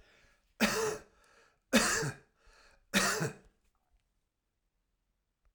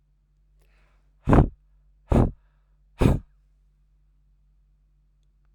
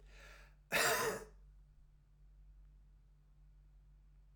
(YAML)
three_cough_length: 5.5 s
three_cough_amplitude: 7483
three_cough_signal_mean_std_ratio: 0.36
exhalation_length: 5.5 s
exhalation_amplitude: 25422
exhalation_signal_mean_std_ratio: 0.25
cough_length: 4.4 s
cough_amplitude: 2788
cough_signal_mean_std_ratio: 0.37
survey_phase: alpha (2021-03-01 to 2021-08-12)
age: 45-64
gender: Male
wearing_mask: 'No'
symptom_none: true
smoker_status: Ex-smoker
respiratory_condition_asthma: false
respiratory_condition_other: false
recruitment_source: REACT
submission_delay: 4 days
covid_test_result: Negative
covid_test_method: RT-qPCR